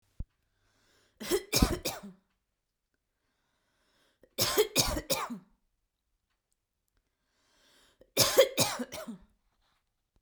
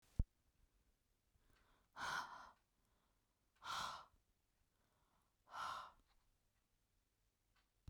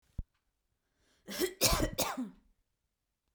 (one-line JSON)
{"three_cough_length": "10.2 s", "three_cough_amplitude": 15025, "three_cough_signal_mean_std_ratio": 0.31, "exhalation_length": "7.9 s", "exhalation_amplitude": 2036, "exhalation_signal_mean_std_ratio": 0.29, "cough_length": "3.3 s", "cough_amplitude": 7514, "cough_signal_mean_std_ratio": 0.38, "survey_phase": "beta (2021-08-13 to 2022-03-07)", "age": "18-44", "gender": "Female", "wearing_mask": "No", "symptom_none": true, "smoker_status": "Never smoked", "respiratory_condition_asthma": false, "respiratory_condition_other": false, "recruitment_source": "Test and Trace", "submission_delay": "4 days", "covid_test_result": "Positive", "covid_test_method": "RT-qPCR"}